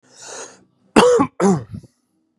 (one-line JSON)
{"cough_length": "2.4 s", "cough_amplitude": 32768, "cough_signal_mean_std_ratio": 0.42, "survey_phase": "beta (2021-08-13 to 2022-03-07)", "age": "18-44", "gender": "Male", "wearing_mask": "No", "symptom_cough_any": true, "symptom_fever_high_temperature": true, "symptom_headache": true, "symptom_onset": "2 days", "smoker_status": "Never smoked", "respiratory_condition_asthma": false, "respiratory_condition_other": false, "recruitment_source": "REACT", "submission_delay": "2 days", "covid_test_result": "Negative", "covid_test_method": "RT-qPCR", "influenza_a_test_result": "Negative", "influenza_b_test_result": "Negative"}